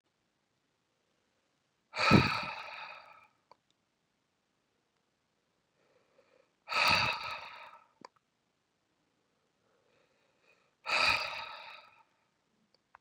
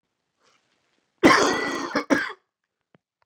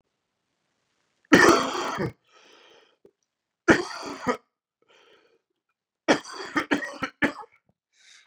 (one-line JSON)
{"exhalation_length": "13.0 s", "exhalation_amplitude": 10609, "exhalation_signal_mean_std_ratio": 0.27, "cough_length": "3.3 s", "cough_amplitude": 28057, "cough_signal_mean_std_ratio": 0.36, "three_cough_length": "8.3 s", "three_cough_amplitude": 27774, "three_cough_signal_mean_std_ratio": 0.3, "survey_phase": "beta (2021-08-13 to 2022-03-07)", "age": "18-44", "gender": "Male", "wearing_mask": "No", "symptom_new_continuous_cough": true, "symptom_runny_or_blocked_nose": true, "symptom_diarrhoea": true, "symptom_fever_high_temperature": true, "symptom_headache": true, "symptom_change_to_sense_of_smell_or_taste": true, "symptom_onset": "3 days", "smoker_status": "Never smoked", "respiratory_condition_asthma": false, "respiratory_condition_other": false, "recruitment_source": "Test and Trace", "submission_delay": "1 day", "covid_test_result": "Positive", "covid_test_method": "RT-qPCR", "covid_ct_value": 21.3, "covid_ct_gene": "ORF1ab gene"}